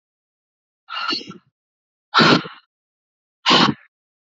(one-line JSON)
{"exhalation_length": "4.4 s", "exhalation_amplitude": 28456, "exhalation_signal_mean_std_ratio": 0.33, "survey_phase": "alpha (2021-03-01 to 2021-08-12)", "age": "18-44", "gender": "Female", "wearing_mask": "No", "symptom_cough_any": true, "symptom_diarrhoea": true, "symptom_fatigue": true, "symptom_change_to_sense_of_smell_or_taste": true, "symptom_onset": "4 days", "smoker_status": "Never smoked", "respiratory_condition_asthma": false, "respiratory_condition_other": false, "recruitment_source": "Test and Trace", "submission_delay": "2 days", "covid_test_result": "Positive", "covid_test_method": "RT-qPCR", "covid_ct_value": 18.5, "covid_ct_gene": "ORF1ab gene"}